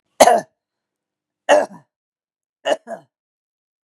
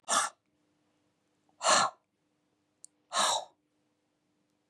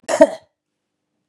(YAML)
three_cough_length: 3.8 s
three_cough_amplitude: 32768
three_cough_signal_mean_std_ratio: 0.26
exhalation_length: 4.7 s
exhalation_amplitude: 9027
exhalation_signal_mean_std_ratio: 0.32
cough_length: 1.3 s
cough_amplitude: 32768
cough_signal_mean_std_ratio: 0.26
survey_phase: beta (2021-08-13 to 2022-03-07)
age: 45-64
gender: Female
wearing_mask: 'No'
symptom_cough_any: true
symptom_runny_or_blocked_nose: true
symptom_fatigue: true
symptom_other: true
symptom_onset: 2 days
smoker_status: Never smoked
respiratory_condition_asthma: false
respiratory_condition_other: true
recruitment_source: Test and Trace
submission_delay: 1 day
covid_test_result: Positive
covid_test_method: RT-qPCR
covid_ct_value: 30.4
covid_ct_gene: N gene
covid_ct_mean: 30.5
covid_viral_load: 96 copies/ml
covid_viral_load_category: Minimal viral load (< 10K copies/ml)